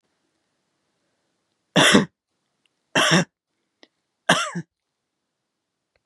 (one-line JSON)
{"three_cough_length": "6.1 s", "three_cough_amplitude": 29699, "three_cough_signal_mean_std_ratio": 0.28, "survey_phase": "beta (2021-08-13 to 2022-03-07)", "age": "45-64", "gender": "Female", "wearing_mask": "No", "symptom_cough_any": true, "symptom_runny_or_blocked_nose": true, "symptom_fatigue": true, "symptom_other": true, "symptom_onset": "2 days", "smoker_status": "Never smoked", "respiratory_condition_asthma": false, "respiratory_condition_other": false, "recruitment_source": "Test and Trace", "submission_delay": "1 day", "covid_test_result": "Positive", "covid_test_method": "RT-qPCR", "covid_ct_value": 17.0, "covid_ct_gene": "ORF1ab gene", "covid_ct_mean": 17.4, "covid_viral_load": "1900000 copies/ml", "covid_viral_load_category": "High viral load (>1M copies/ml)"}